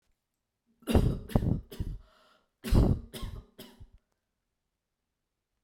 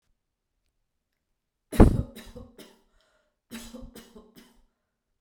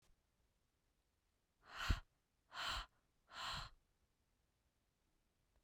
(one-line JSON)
{"cough_length": "5.6 s", "cough_amplitude": 11862, "cough_signal_mean_std_ratio": 0.34, "three_cough_length": "5.2 s", "three_cough_amplitude": 25357, "three_cough_signal_mean_std_ratio": 0.17, "exhalation_length": "5.6 s", "exhalation_amplitude": 2216, "exhalation_signal_mean_std_ratio": 0.3, "survey_phase": "beta (2021-08-13 to 2022-03-07)", "age": "18-44", "gender": "Female", "wearing_mask": "No", "symptom_runny_or_blocked_nose": true, "symptom_headache": true, "symptom_onset": "13 days", "smoker_status": "Never smoked", "respiratory_condition_asthma": false, "respiratory_condition_other": false, "recruitment_source": "REACT", "submission_delay": "7 days", "covid_test_result": "Negative", "covid_test_method": "RT-qPCR"}